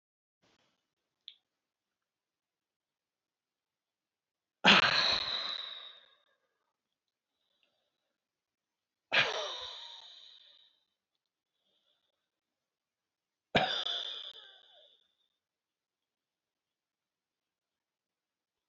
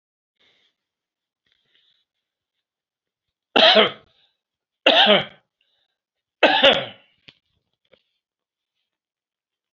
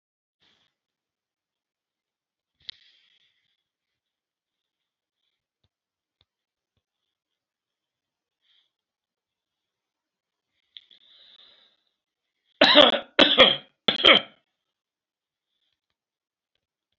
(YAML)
exhalation_length: 18.7 s
exhalation_amplitude: 11525
exhalation_signal_mean_std_ratio: 0.23
three_cough_length: 9.7 s
three_cough_amplitude: 32580
three_cough_signal_mean_std_ratio: 0.26
cough_length: 17.0 s
cough_amplitude: 32768
cough_signal_mean_std_ratio: 0.17
survey_phase: alpha (2021-03-01 to 2021-08-12)
age: 65+
gender: Male
wearing_mask: 'No'
symptom_none: true
smoker_status: Ex-smoker
respiratory_condition_asthma: false
respiratory_condition_other: true
recruitment_source: REACT
submission_delay: 2 days
covid_test_result: Negative
covid_test_method: RT-qPCR